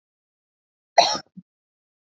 cough_length: 2.1 s
cough_amplitude: 28348
cough_signal_mean_std_ratio: 0.2
survey_phase: beta (2021-08-13 to 2022-03-07)
age: 45-64
gender: Female
wearing_mask: 'No'
symptom_cough_any: true
smoker_status: Never smoked
respiratory_condition_asthma: false
respiratory_condition_other: false
recruitment_source: REACT
submission_delay: 1 day
covid_test_result: Negative
covid_test_method: RT-qPCR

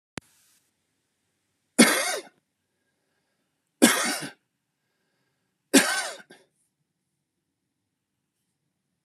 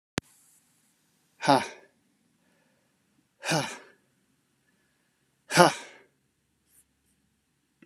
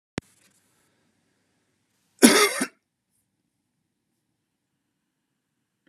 three_cough_length: 9.0 s
three_cough_amplitude: 27388
three_cough_signal_mean_std_ratio: 0.24
exhalation_length: 7.9 s
exhalation_amplitude: 30601
exhalation_signal_mean_std_ratio: 0.2
cough_length: 5.9 s
cough_amplitude: 32767
cough_signal_mean_std_ratio: 0.18
survey_phase: beta (2021-08-13 to 2022-03-07)
age: 45-64
gender: Male
wearing_mask: 'No'
symptom_cough_any: true
symptom_sore_throat: true
symptom_fatigue: true
symptom_fever_high_temperature: true
symptom_headache: true
symptom_other: true
symptom_onset: 3 days
smoker_status: Never smoked
respiratory_condition_asthma: false
respiratory_condition_other: false
recruitment_source: Test and Trace
submission_delay: 2 days
covid_test_result: Positive
covid_test_method: RT-qPCR
covid_ct_value: 21.0
covid_ct_gene: N gene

